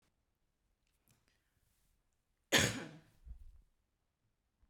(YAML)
cough_length: 4.7 s
cough_amplitude: 5855
cough_signal_mean_std_ratio: 0.21
survey_phase: beta (2021-08-13 to 2022-03-07)
age: 45-64
gender: Female
wearing_mask: 'No'
symptom_none: true
smoker_status: Never smoked
respiratory_condition_asthma: false
respiratory_condition_other: false
recruitment_source: REACT
submission_delay: 1 day
covid_test_result: Negative
covid_test_method: RT-qPCR